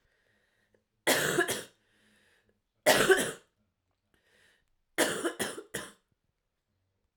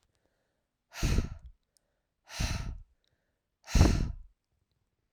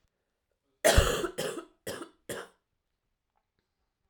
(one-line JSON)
{"three_cough_length": "7.2 s", "three_cough_amplitude": 14000, "three_cough_signal_mean_std_ratio": 0.34, "exhalation_length": "5.1 s", "exhalation_amplitude": 13116, "exhalation_signal_mean_std_ratio": 0.33, "cough_length": "4.1 s", "cough_amplitude": 13534, "cough_signal_mean_std_ratio": 0.3, "survey_phase": "alpha (2021-03-01 to 2021-08-12)", "age": "18-44", "gender": "Female", "wearing_mask": "No", "symptom_cough_any": true, "symptom_headache": true, "smoker_status": "Never smoked", "respiratory_condition_asthma": false, "respiratory_condition_other": false, "recruitment_source": "Test and Trace", "submission_delay": "2 days", "covid_test_result": "Positive", "covid_test_method": "RT-qPCR", "covid_ct_value": 14.7, "covid_ct_gene": "ORF1ab gene", "covid_ct_mean": 15.2, "covid_viral_load": "11000000 copies/ml", "covid_viral_load_category": "High viral load (>1M copies/ml)"}